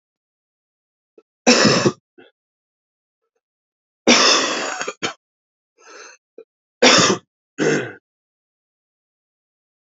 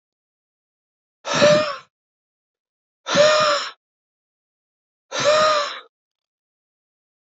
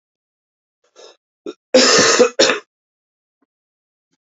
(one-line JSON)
{"three_cough_length": "9.8 s", "three_cough_amplitude": 32160, "three_cough_signal_mean_std_ratio": 0.34, "exhalation_length": "7.3 s", "exhalation_amplitude": 24195, "exhalation_signal_mean_std_ratio": 0.38, "cough_length": "4.4 s", "cough_amplitude": 30862, "cough_signal_mean_std_ratio": 0.34, "survey_phase": "alpha (2021-03-01 to 2021-08-12)", "age": "18-44", "gender": "Male", "wearing_mask": "No", "symptom_cough_any": true, "symptom_change_to_sense_of_smell_or_taste": true, "symptom_loss_of_taste": true, "smoker_status": "Current smoker (11 or more cigarettes per day)", "respiratory_condition_asthma": true, "respiratory_condition_other": false, "recruitment_source": "Test and Trace", "submission_delay": "1 day", "covid_test_result": "Positive", "covid_test_method": "RT-qPCR", "covid_ct_value": 16.2, "covid_ct_gene": "ORF1ab gene"}